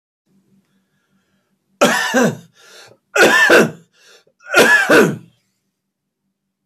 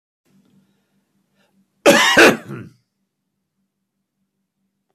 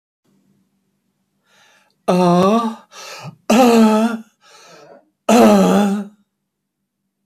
{"three_cough_length": "6.7 s", "three_cough_amplitude": 32768, "three_cough_signal_mean_std_ratio": 0.42, "cough_length": "4.9 s", "cough_amplitude": 32289, "cough_signal_mean_std_ratio": 0.26, "exhalation_length": "7.3 s", "exhalation_amplitude": 32767, "exhalation_signal_mean_std_ratio": 0.46, "survey_phase": "beta (2021-08-13 to 2022-03-07)", "age": "65+", "gender": "Male", "wearing_mask": "No", "symptom_runny_or_blocked_nose": true, "symptom_sore_throat": true, "symptom_headache": true, "symptom_onset": "4 days", "smoker_status": "Ex-smoker", "respiratory_condition_asthma": false, "respiratory_condition_other": true, "recruitment_source": "Test and Trace", "submission_delay": "1 day", "covid_test_result": "Positive", "covid_test_method": "RT-qPCR", "covid_ct_value": 20.0, "covid_ct_gene": "N gene"}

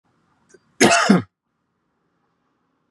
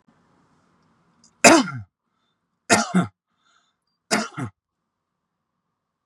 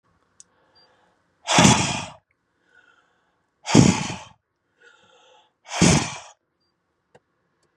{"cough_length": "2.9 s", "cough_amplitude": 30815, "cough_signal_mean_std_ratio": 0.3, "three_cough_length": "6.1 s", "three_cough_amplitude": 32768, "three_cough_signal_mean_std_ratio": 0.25, "exhalation_length": "7.8 s", "exhalation_amplitude": 32767, "exhalation_signal_mean_std_ratio": 0.3, "survey_phase": "beta (2021-08-13 to 2022-03-07)", "age": "18-44", "gender": "Male", "wearing_mask": "No", "symptom_none": true, "smoker_status": "Never smoked", "respiratory_condition_asthma": false, "respiratory_condition_other": false, "recruitment_source": "REACT", "submission_delay": "2 days", "covid_test_result": "Negative", "covid_test_method": "RT-qPCR", "influenza_a_test_result": "Unknown/Void", "influenza_b_test_result": "Unknown/Void"}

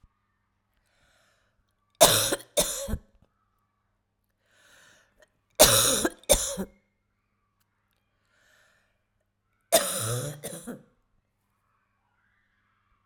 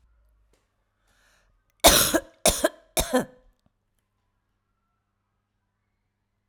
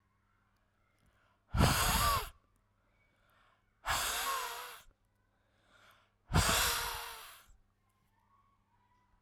{"three_cough_length": "13.1 s", "three_cough_amplitude": 32767, "three_cough_signal_mean_std_ratio": 0.28, "cough_length": "6.5 s", "cough_amplitude": 32510, "cough_signal_mean_std_ratio": 0.25, "exhalation_length": "9.2 s", "exhalation_amplitude": 5642, "exhalation_signal_mean_std_ratio": 0.4, "survey_phase": "alpha (2021-03-01 to 2021-08-12)", "age": "45-64", "gender": "Female", "wearing_mask": "No", "symptom_none": true, "smoker_status": "Ex-smoker", "respiratory_condition_asthma": false, "respiratory_condition_other": false, "recruitment_source": "REACT", "submission_delay": "2 days", "covid_test_result": "Negative", "covid_test_method": "RT-qPCR"}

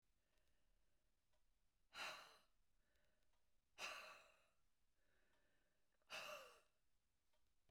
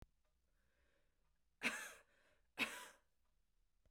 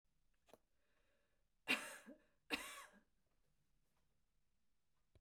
{"exhalation_length": "7.7 s", "exhalation_amplitude": 381, "exhalation_signal_mean_std_ratio": 0.41, "three_cough_length": "3.9 s", "three_cough_amplitude": 1596, "three_cough_signal_mean_std_ratio": 0.29, "cough_length": "5.2 s", "cough_amplitude": 1583, "cough_signal_mean_std_ratio": 0.25, "survey_phase": "beta (2021-08-13 to 2022-03-07)", "age": "65+", "gender": "Female", "wearing_mask": "No", "symptom_none": true, "smoker_status": "Never smoked", "respiratory_condition_asthma": true, "respiratory_condition_other": false, "recruitment_source": "REACT", "submission_delay": "2 days", "covid_test_result": "Negative", "covid_test_method": "RT-qPCR"}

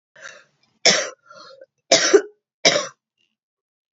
{"three_cough_length": "3.9 s", "three_cough_amplitude": 31595, "three_cough_signal_mean_std_ratio": 0.32, "survey_phase": "beta (2021-08-13 to 2022-03-07)", "age": "18-44", "gender": "Female", "wearing_mask": "No", "symptom_runny_or_blocked_nose": true, "symptom_sore_throat": true, "symptom_fatigue": true, "symptom_headache": true, "smoker_status": "Never smoked", "respiratory_condition_asthma": true, "respiratory_condition_other": false, "recruitment_source": "Test and Trace", "submission_delay": "2 days", "covid_test_result": "Positive", "covid_test_method": "RT-qPCR", "covid_ct_value": 22.5, "covid_ct_gene": "N gene"}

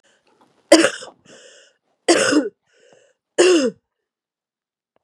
{"three_cough_length": "5.0 s", "three_cough_amplitude": 32768, "three_cough_signal_mean_std_ratio": 0.34, "survey_phase": "beta (2021-08-13 to 2022-03-07)", "age": "45-64", "gender": "Female", "wearing_mask": "No", "symptom_cough_any": true, "symptom_runny_or_blocked_nose": true, "symptom_sore_throat": true, "symptom_fatigue": true, "symptom_other": true, "symptom_onset": "2 days", "smoker_status": "Ex-smoker", "respiratory_condition_asthma": false, "respiratory_condition_other": false, "recruitment_source": "Test and Trace", "submission_delay": "1 day", "covid_test_result": "Positive", "covid_test_method": "RT-qPCR", "covid_ct_value": 26.5, "covid_ct_gene": "ORF1ab gene"}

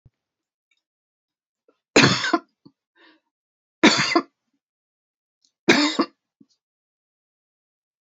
{"three_cough_length": "8.2 s", "three_cough_amplitude": 29591, "three_cough_signal_mean_std_ratio": 0.26, "survey_phase": "beta (2021-08-13 to 2022-03-07)", "age": "45-64", "gender": "Female", "wearing_mask": "No", "symptom_shortness_of_breath": true, "smoker_status": "Ex-smoker", "respiratory_condition_asthma": true, "respiratory_condition_other": false, "recruitment_source": "Test and Trace", "submission_delay": "1 day", "covid_test_result": "Negative", "covid_test_method": "RT-qPCR"}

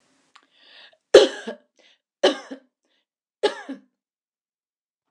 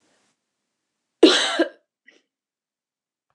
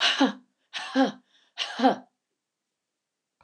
{"three_cough_length": "5.1 s", "three_cough_amplitude": 29204, "three_cough_signal_mean_std_ratio": 0.2, "cough_length": "3.3 s", "cough_amplitude": 29203, "cough_signal_mean_std_ratio": 0.24, "exhalation_length": "3.4 s", "exhalation_amplitude": 16234, "exhalation_signal_mean_std_ratio": 0.38, "survey_phase": "beta (2021-08-13 to 2022-03-07)", "age": "65+", "gender": "Female", "wearing_mask": "No", "symptom_none": true, "smoker_status": "Never smoked", "respiratory_condition_asthma": false, "respiratory_condition_other": false, "recruitment_source": "REACT", "submission_delay": "1 day", "covid_test_result": "Negative", "covid_test_method": "RT-qPCR", "influenza_a_test_result": "Negative", "influenza_b_test_result": "Negative"}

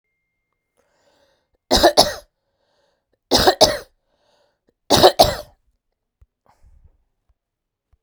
{"three_cough_length": "8.0 s", "three_cough_amplitude": 32768, "three_cough_signal_mean_std_ratio": 0.27, "survey_phase": "beta (2021-08-13 to 2022-03-07)", "age": "45-64", "gender": "Female", "wearing_mask": "No", "symptom_cough_any": true, "symptom_runny_or_blocked_nose": true, "symptom_shortness_of_breath": true, "symptom_diarrhoea": true, "symptom_fever_high_temperature": true, "symptom_change_to_sense_of_smell_or_taste": true, "symptom_loss_of_taste": true, "symptom_onset": "4 days", "smoker_status": "Ex-smoker", "respiratory_condition_asthma": false, "respiratory_condition_other": false, "recruitment_source": "Test and Trace", "submission_delay": "3 days", "covid_test_result": "Positive", "covid_test_method": "ePCR"}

